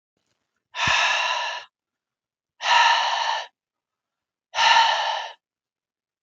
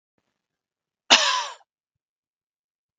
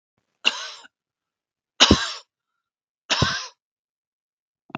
{"exhalation_length": "6.2 s", "exhalation_amplitude": 22605, "exhalation_signal_mean_std_ratio": 0.5, "cough_length": "3.0 s", "cough_amplitude": 32768, "cough_signal_mean_std_ratio": 0.24, "three_cough_length": "4.8 s", "three_cough_amplitude": 32768, "three_cough_signal_mean_std_ratio": 0.26, "survey_phase": "beta (2021-08-13 to 2022-03-07)", "age": "18-44", "gender": "Male", "wearing_mask": "No", "symptom_none": true, "smoker_status": "Never smoked", "respiratory_condition_asthma": false, "respiratory_condition_other": false, "recruitment_source": "REACT", "submission_delay": "2 days", "covid_test_result": "Negative", "covid_test_method": "RT-qPCR"}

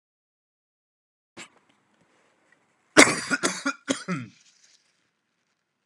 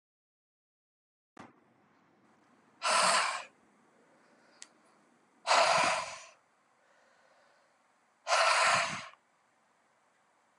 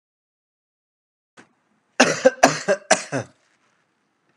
{"cough_length": "5.9 s", "cough_amplitude": 32767, "cough_signal_mean_std_ratio": 0.22, "exhalation_length": "10.6 s", "exhalation_amplitude": 8658, "exhalation_signal_mean_std_ratio": 0.35, "three_cough_length": "4.4 s", "three_cough_amplitude": 32768, "three_cough_signal_mean_std_ratio": 0.27, "survey_phase": "alpha (2021-03-01 to 2021-08-12)", "age": "18-44", "gender": "Male", "wearing_mask": "No", "symptom_cough_any": true, "symptom_fatigue": true, "symptom_change_to_sense_of_smell_or_taste": true, "symptom_onset": "2 days", "smoker_status": "Never smoked", "respiratory_condition_asthma": false, "respiratory_condition_other": false, "recruitment_source": "Test and Trace", "submission_delay": "1 day", "covid_test_result": "Positive", "covid_test_method": "RT-qPCR"}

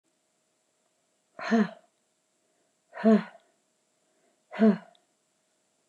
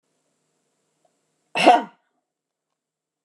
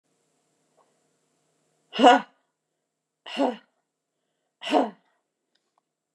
{"exhalation_length": "5.9 s", "exhalation_amplitude": 11133, "exhalation_signal_mean_std_ratio": 0.26, "cough_length": "3.2 s", "cough_amplitude": 29201, "cough_signal_mean_std_ratio": 0.21, "three_cough_length": "6.1 s", "three_cough_amplitude": 22936, "three_cough_signal_mean_std_ratio": 0.22, "survey_phase": "beta (2021-08-13 to 2022-03-07)", "age": "45-64", "gender": "Female", "wearing_mask": "No", "symptom_none": true, "smoker_status": "Ex-smoker", "respiratory_condition_asthma": false, "respiratory_condition_other": false, "recruitment_source": "REACT", "submission_delay": "3 days", "covid_test_result": "Negative", "covid_test_method": "RT-qPCR"}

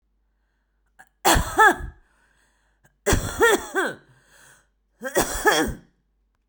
{"three_cough_length": "6.5 s", "three_cough_amplitude": 26403, "three_cough_signal_mean_std_ratio": 0.39, "survey_phase": "beta (2021-08-13 to 2022-03-07)", "age": "45-64", "gender": "Female", "wearing_mask": "No", "symptom_none": true, "smoker_status": "Current smoker (11 or more cigarettes per day)", "respiratory_condition_asthma": false, "respiratory_condition_other": false, "recruitment_source": "REACT", "submission_delay": "2 days", "covid_test_result": "Negative", "covid_test_method": "RT-qPCR"}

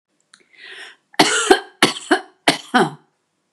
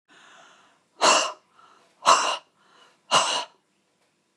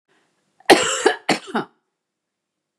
{"three_cough_length": "3.5 s", "three_cough_amplitude": 32768, "three_cough_signal_mean_std_ratio": 0.37, "exhalation_length": "4.4 s", "exhalation_amplitude": 25572, "exhalation_signal_mean_std_ratio": 0.35, "cough_length": "2.8 s", "cough_amplitude": 32768, "cough_signal_mean_std_ratio": 0.32, "survey_phase": "beta (2021-08-13 to 2022-03-07)", "age": "45-64", "gender": "Female", "wearing_mask": "No", "symptom_none": true, "smoker_status": "Ex-smoker", "respiratory_condition_asthma": false, "respiratory_condition_other": false, "recruitment_source": "REACT", "submission_delay": "2 days", "covid_test_result": "Negative", "covid_test_method": "RT-qPCR", "influenza_a_test_result": "Negative", "influenza_b_test_result": "Negative"}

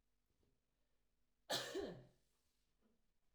{"cough_length": "3.3 s", "cough_amplitude": 1100, "cough_signal_mean_std_ratio": 0.32, "survey_phase": "alpha (2021-03-01 to 2021-08-12)", "age": "18-44", "gender": "Female", "wearing_mask": "No", "symptom_none": true, "smoker_status": "Never smoked", "respiratory_condition_asthma": false, "respiratory_condition_other": false, "recruitment_source": "REACT", "submission_delay": "1 day", "covid_test_result": "Negative", "covid_test_method": "RT-qPCR"}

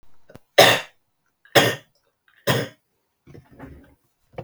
{"three_cough_length": "4.4 s", "three_cough_amplitude": 32768, "three_cough_signal_mean_std_ratio": 0.28, "survey_phase": "beta (2021-08-13 to 2022-03-07)", "age": "45-64", "gender": "Male", "wearing_mask": "No", "symptom_none": true, "smoker_status": "Never smoked", "respiratory_condition_asthma": false, "respiratory_condition_other": false, "recruitment_source": "REACT", "submission_delay": "2 days", "covid_test_result": "Negative", "covid_test_method": "RT-qPCR", "influenza_a_test_result": "Negative", "influenza_b_test_result": "Negative"}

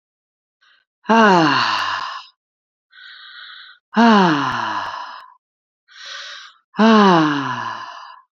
{"exhalation_length": "8.4 s", "exhalation_amplitude": 28723, "exhalation_signal_mean_std_ratio": 0.48, "survey_phase": "beta (2021-08-13 to 2022-03-07)", "age": "45-64", "gender": "Female", "wearing_mask": "No", "symptom_none": true, "smoker_status": "Ex-smoker", "respiratory_condition_asthma": false, "respiratory_condition_other": false, "recruitment_source": "REACT", "submission_delay": "2 days", "covid_test_result": "Negative", "covid_test_method": "RT-qPCR"}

